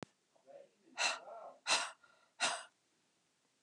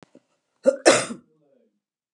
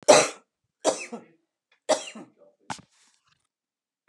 {
  "exhalation_length": "3.6 s",
  "exhalation_amplitude": 3486,
  "exhalation_signal_mean_std_ratio": 0.37,
  "cough_length": "2.1 s",
  "cough_amplitude": 31762,
  "cough_signal_mean_std_ratio": 0.27,
  "three_cough_length": "4.1 s",
  "three_cough_amplitude": 25829,
  "three_cough_signal_mean_std_ratio": 0.25,
  "survey_phase": "beta (2021-08-13 to 2022-03-07)",
  "age": "45-64",
  "gender": "Female",
  "wearing_mask": "No",
  "symptom_none": true,
  "symptom_onset": "12 days",
  "smoker_status": "Never smoked",
  "respiratory_condition_asthma": false,
  "respiratory_condition_other": false,
  "recruitment_source": "REACT",
  "submission_delay": "2 days",
  "covid_test_result": "Negative",
  "covid_test_method": "RT-qPCR",
  "influenza_a_test_result": "Unknown/Void",
  "influenza_b_test_result": "Unknown/Void"
}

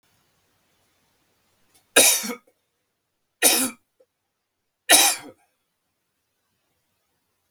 {
  "three_cough_length": "7.5 s",
  "three_cough_amplitude": 32766,
  "three_cough_signal_mean_std_ratio": 0.25,
  "survey_phase": "beta (2021-08-13 to 2022-03-07)",
  "age": "45-64",
  "gender": "Male",
  "wearing_mask": "No",
  "symptom_cough_any": true,
  "symptom_onset": "5 days",
  "smoker_status": "Never smoked",
  "respiratory_condition_asthma": false,
  "respiratory_condition_other": false,
  "recruitment_source": "Test and Trace",
  "submission_delay": "2 days",
  "covid_test_result": "Positive",
  "covid_test_method": "ePCR"
}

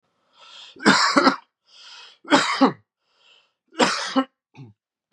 {
  "three_cough_length": "5.1 s",
  "three_cough_amplitude": 30469,
  "three_cough_signal_mean_std_ratio": 0.39,
  "survey_phase": "beta (2021-08-13 to 2022-03-07)",
  "age": "18-44",
  "gender": "Male",
  "wearing_mask": "No",
  "symptom_cough_any": true,
  "symptom_shortness_of_breath": true,
  "symptom_sore_throat": true,
  "symptom_fatigue": true,
  "symptom_fever_high_temperature": true,
  "symptom_onset": "3 days",
  "smoker_status": "Ex-smoker",
  "respiratory_condition_asthma": false,
  "respiratory_condition_other": false,
  "recruitment_source": "Test and Trace",
  "submission_delay": "1 day",
  "covid_test_result": "Positive",
  "covid_test_method": "RT-qPCR",
  "covid_ct_value": 22.9,
  "covid_ct_gene": "ORF1ab gene",
  "covid_ct_mean": 23.3,
  "covid_viral_load": "22000 copies/ml",
  "covid_viral_load_category": "Low viral load (10K-1M copies/ml)"
}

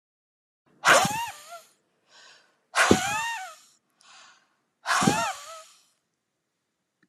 {
  "exhalation_length": "7.1 s",
  "exhalation_amplitude": 24856,
  "exhalation_signal_mean_std_ratio": 0.36,
  "survey_phase": "alpha (2021-03-01 to 2021-08-12)",
  "age": "45-64",
  "gender": "Female",
  "wearing_mask": "No",
  "symptom_none": true,
  "smoker_status": "Never smoked",
  "respiratory_condition_asthma": false,
  "respiratory_condition_other": false,
  "recruitment_source": "REACT",
  "submission_delay": "1 day",
  "covid_test_result": "Negative",
  "covid_test_method": "RT-qPCR"
}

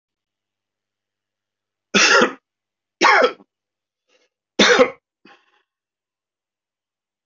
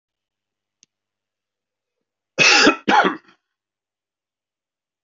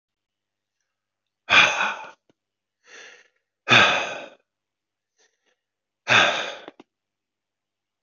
{
  "three_cough_length": "7.3 s",
  "three_cough_amplitude": 27687,
  "three_cough_signal_mean_std_ratio": 0.29,
  "cough_length": "5.0 s",
  "cough_amplitude": 27370,
  "cough_signal_mean_std_ratio": 0.28,
  "exhalation_length": "8.0 s",
  "exhalation_amplitude": 24909,
  "exhalation_signal_mean_std_ratio": 0.3,
  "survey_phase": "beta (2021-08-13 to 2022-03-07)",
  "age": "65+",
  "gender": "Male",
  "wearing_mask": "No",
  "symptom_none": true,
  "smoker_status": "Ex-smoker",
  "respiratory_condition_asthma": false,
  "respiratory_condition_other": false,
  "recruitment_source": "REACT",
  "submission_delay": "2 days",
  "covid_test_result": "Negative",
  "covid_test_method": "RT-qPCR",
  "influenza_a_test_result": "Negative",
  "influenza_b_test_result": "Negative"
}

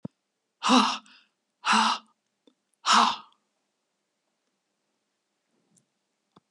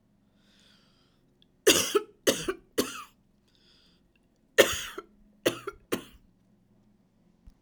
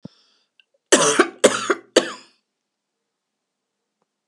{
  "exhalation_length": "6.5 s",
  "exhalation_amplitude": 15223,
  "exhalation_signal_mean_std_ratio": 0.3,
  "three_cough_length": "7.6 s",
  "three_cough_amplitude": 22227,
  "three_cough_signal_mean_std_ratio": 0.27,
  "cough_length": "4.3 s",
  "cough_amplitude": 32768,
  "cough_signal_mean_std_ratio": 0.29,
  "survey_phase": "alpha (2021-03-01 to 2021-08-12)",
  "age": "65+",
  "gender": "Female",
  "wearing_mask": "No",
  "symptom_none": true,
  "symptom_onset": "3 days",
  "smoker_status": "Never smoked",
  "respiratory_condition_asthma": false,
  "respiratory_condition_other": false,
  "recruitment_source": "REACT",
  "submission_delay": "2 days",
  "covid_test_result": "Negative",
  "covid_test_method": "RT-qPCR"
}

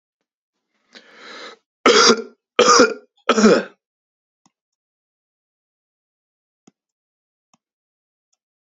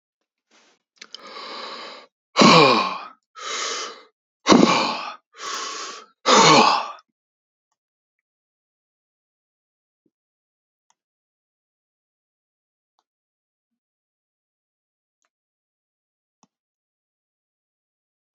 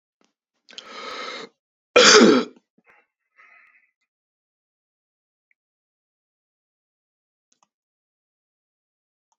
{
  "three_cough_length": "8.8 s",
  "three_cough_amplitude": 32768,
  "three_cough_signal_mean_std_ratio": 0.27,
  "exhalation_length": "18.3 s",
  "exhalation_amplitude": 30692,
  "exhalation_signal_mean_std_ratio": 0.26,
  "cough_length": "9.4 s",
  "cough_amplitude": 32767,
  "cough_signal_mean_std_ratio": 0.2,
  "survey_phase": "beta (2021-08-13 to 2022-03-07)",
  "age": "18-44",
  "gender": "Male",
  "wearing_mask": "No",
  "symptom_none": true,
  "smoker_status": "Never smoked",
  "respiratory_condition_asthma": false,
  "respiratory_condition_other": false,
  "recruitment_source": "REACT",
  "submission_delay": "1 day",
  "covid_test_result": "Negative",
  "covid_test_method": "RT-qPCR",
  "influenza_a_test_result": "Unknown/Void",
  "influenza_b_test_result": "Unknown/Void"
}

